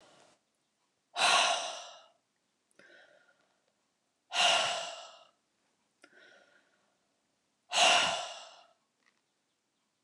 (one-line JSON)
{"exhalation_length": "10.0 s", "exhalation_amplitude": 8245, "exhalation_signal_mean_std_ratio": 0.33, "survey_phase": "alpha (2021-03-01 to 2021-08-12)", "age": "65+", "gender": "Female", "wearing_mask": "No", "symptom_none": true, "smoker_status": "Never smoked", "respiratory_condition_asthma": false, "respiratory_condition_other": false, "recruitment_source": "REACT", "submission_delay": "1 day", "covid_test_result": "Negative", "covid_test_method": "RT-qPCR"}